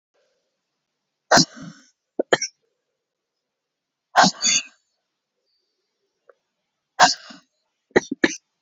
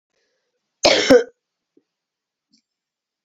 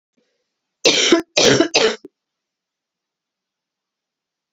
{"exhalation_length": "8.6 s", "exhalation_amplitude": 32767, "exhalation_signal_mean_std_ratio": 0.24, "cough_length": "3.2 s", "cough_amplitude": 31983, "cough_signal_mean_std_ratio": 0.26, "three_cough_length": "4.5 s", "three_cough_amplitude": 32767, "three_cough_signal_mean_std_ratio": 0.35, "survey_phase": "beta (2021-08-13 to 2022-03-07)", "age": "45-64", "gender": "Female", "wearing_mask": "No", "symptom_cough_any": true, "symptom_runny_or_blocked_nose": true, "symptom_shortness_of_breath": true, "symptom_fatigue": true, "symptom_fever_high_temperature": true, "symptom_headache": true, "symptom_change_to_sense_of_smell_or_taste": true, "symptom_loss_of_taste": true, "symptom_other": true, "symptom_onset": "4 days", "smoker_status": "Never smoked", "respiratory_condition_asthma": false, "respiratory_condition_other": false, "recruitment_source": "Test and Trace", "submission_delay": "2 days", "covid_test_result": "Positive", "covid_test_method": "ePCR"}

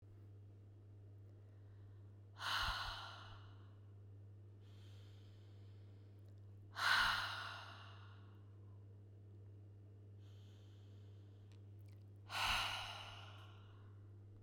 {"exhalation_length": "14.4 s", "exhalation_amplitude": 2177, "exhalation_signal_mean_std_ratio": 0.57, "survey_phase": "beta (2021-08-13 to 2022-03-07)", "age": "45-64", "gender": "Female", "wearing_mask": "No", "symptom_none": true, "smoker_status": "Current smoker (1 to 10 cigarettes per day)", "respiratory_condition_asthma": false, "respiratory_condition_other": false, "recruitment_source": "REACT", "submission_delay": "14 days", "covid_test_result": "Negative", "covid_test_method": "RT-qPCR"}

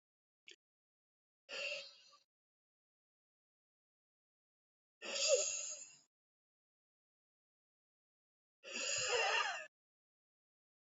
{"exhalation_length": "10.9 s", "exhalation_amplitude": 3072, "exhalation_signal_mean_std_ratio": 0.33, "survey_phase": "beta (2021-08-13 to 2022-03-07)", "age": "45-64", "gender": "Female", "wearing_mask": "No", "symptom_none": true, "smoker_status": "Ex-smoker", "respiratory_condition_asthma": false, "respiratory_condition_other": false, "recruitment_source": "REACT", "submission_delay": "4 days", "covid_test_result": "Negative", "covid_test_method": "RT-qPCR", "influenza_a_test_result": "Negative", "influenza_b_test_result": "Negative"}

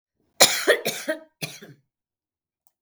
{"cough_length": "2.8 s", "cough_amplitude": 32768, "cough_signal_mean_std_ratio": 0.31, "survey_phase": "beta (2021-08-13 to 2022-03-07)", "age": "65+", "gender": "Female", "wearing_mask": "No", "symptom_none": true, "smoker_status": "Never smoked", "respiratory_condition_asthma": true, "respiratory_condition_other": false, "recruitment_source": "REACT", "submission_delay": "2 days", "covid_test_result": "Negative", "covid_test_method": "RT-qPCR", "influenza_a_test_result": "Negative", "influenza_b_test_result": "Negative"}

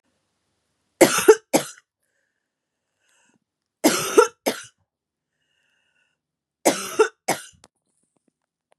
{"three_cough_length": "8.8 s", "three_cough_amplitude": 32767, "three_cough_signal_mean_std_ratio": 0.25, "survey_phase": "beta (2021-08-13 to 2022-03-07)", "age": "18-44", "gender": "Female", "wearing_mask": "No", "symptom_cough_any": true, "symptom_runny_or_blocked_nose": true, "symptom_sore_throat": true, "symptom_fatigue": true, "symptom_headache": true, "symptom_onset": "3 days", "smoker_status": "Never smoked", "respiratory_condition_asthma": false, "respiratory_condition_other": false, "recruitment_source": "Test and Trace", "submission_delay": "1 day", "covid_test_result": "Positive", "covid_test_method": "RT-qPCR", "covid_ct_value": 18.0, "covid_ct_gene": "ORF1ab gene", "covid_ct_mean": 18.1, "covid_viral_load": "1200000 copies/ml", "covid_viral_load_category": "High viral load (>1M copies/ml)"}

